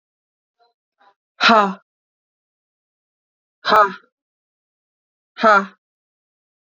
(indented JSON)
{
  "exhalation_length": "6.7 s",
  "exhalation_amplitude": 31282,
  "exhalation_signal_mean_std_ratio": 0.25,
  "survey_phase": "beta (2021-08-13 to 2022-03-07)",
  "age": "45-64",
  "gender": "Female",
  "wearing_mask": "No",
  "symptom_none": true,
  "smoker_status": "Never smoked",
  "respiratory_condition_asthma": false,
  "respiratory_condition_other": false,
  "recruitment_source": "REACT",
  "submission_delay": "3 days",
  "covid_test_result": "Negative",
  "covid_test_method": "RT-qPCR",
  "influenza_a_test_result": "Negative",
  "influenza_b_test_result": "Negative"
}